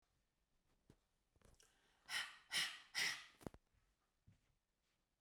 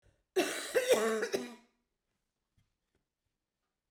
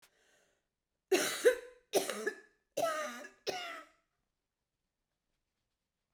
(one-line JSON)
{"exhalation_length": "5.2 s", "exhalation_amplitude": 1226, "exhalation_signal_mean_std_ratio": 0.31, "cough_length": "3.9 s", "cough_amplitude": 6401, "cough_signal_mean_std_ratio": 0.38, "three_cough_length": "6.1 s", "three_cough_amplitude": 5968, "three_cough_signal_mean_std_ratio": 0.34, "survey_phase": "beta (2021-08-13 to 2022-03-07)", "age": "45-64", "gender": "Female", "wearing_mask": "No", "symptom_cough_any": true, "symptom_runny_or_blocked_nose": true, "symptom_fatigue": true, "symptom_change_to_sense_of_smell_or_taste": true, "symptom_loss_of_taste": true, "symptom_onset": "2 days", "smoker_status": "Never smoked", "respiratory_condition_asthma": false, "respiratory_condition_other": false, "recruitment_source": "Test and Trace", "submission_delay": "2 days", "covid_test_result": "Positive", "covid_test_method": "RT-qPCR", "covid_ct_value": 22.1, "covid_ct_gene": "ORF1ab gene", "covid_ct_mean": 22.5, "covid_viral_load": "41000 copies/ml", "covid_viral_load_category": "Low viral load (10K-1M copies/ml)"}